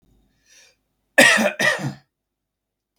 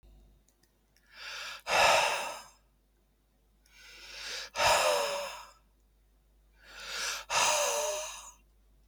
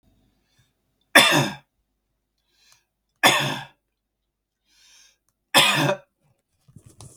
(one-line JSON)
{"cough_length": "3.0 s", "cough_amplitude": 32768, "cough_signal_mean_std_ratio": 0.34, "exhalation_length": "8.9 s", "exhalation_amplitude": 9017, "exhalation_signal_mean_std_ratio": 0.48, "three_cough_length": "7.2 s", "three_cough_amplitude": 32768, "three_cough_signal_mean_std_ratio": 0.29, "survey_phase": "beta (2021-08-13 to 2022-03-07)", "age": "45-64", "gender": "Male", "wearing_mask": "No", "symptom_none": true, "smoker_status": "Ex-smoker", "respiratory_condition_asthma": false, "respiratory_condition_other": false, "recruitment_source": "REACT", "submission_delay": "1 day", "covid_test_result": "Negative", "covid_test_method": "RT-qPCR"}